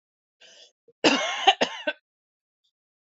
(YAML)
cough_length: 3.1 s
cough_amplitude: 24629
cough_signal_mean_std_ratio: 0.31
survey_phase: beta (2021-08-13 to 2022-03-07)
age: 45-64
gender: Female
wearing_mask: 'No'
symptom_new_continuous_cough: true
symptom_shortness_of_breath: true
symptom_sore_throat: true
symptom_fatigue: true
symptom_fever_high_temperature: true
symptom_headache: true
symptom_onset: 4 days
smoker_status: Ex-smoker
respiratory_condition_asthma: false
respiratory_condition_other: true
recruitment_source: Test and Trace
submission_delay: 2 days
covid_test_result: Positive
covid_test_method: RT-qPCR
covid_ct_value: 21.0
covid_ct_gene: N gene